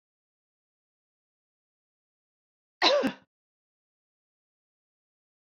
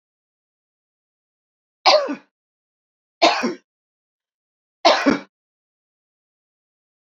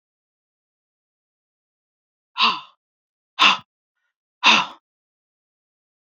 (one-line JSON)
{"cough_length": "5.5 s", "cough_amplitude": 13698, "cough_signal_mean_std_ratio": 0.19, "three_cough_length": "7.2 s", "three_cough_amplitude": 28435, "three_cough_signal_mean_std_ratio": 0.26, "exhalation_length": "6.1 s", "exhalation_amplitude": 28124, "exhalation_signal_mean_std_ratio": 0.23, "survey_phase": "beta (2021-08-13 to 2022-03-07)", "age": "65+", "gender": "Female", "wearing_mask": "No", "symptom_runny_or_blocked_nose": true, "smoker_status": "Never smoked", "respiratory_condition_asthma": false, "respiratory_condition_other": false, "recruitment_source": "REACT", "submission_delay": "1 day", "covid_test_result": "Negative", "covid_test_method": "RT-qPCR"}